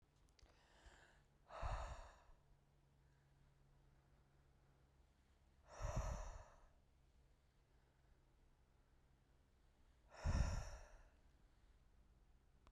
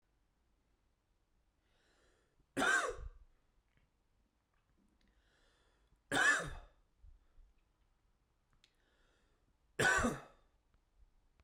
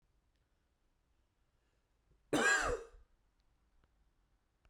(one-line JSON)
{"exhalation_length": "12.7 s", "exhalation_amplitude": 1176, "exhalation_signal_mean_std_ratio": 0.35, "three_cough_length": "11.4 s", "three_cough_amplitude": 3397, "three_cough_signal_mean_std_ratio": 0.28, "cough_length": "4.7 s", "cough_amplitude": 3461, "cough_signal_mean_std_ratio": 0.27, "survey_phase": "beta (2021-08-13 to 2022-03-07)", "age": "18-44", "gender": "Male", "wearing_mask": "No", "symptom_none": true, "smoker_status": "Current smoker (1 to 10 cigarettes per day)", "respiratory_condition_asthma": false, "respiratory_condition_other": false, "recruitment_source": "REACT", "submission_delay": "1 day", "covid_test_result": "Negative", "covid_test_method": "RT-qPCR", "influenza_a_test_result": "Unknown/Void", "influenza_b_test_result": "Unknown/Void"}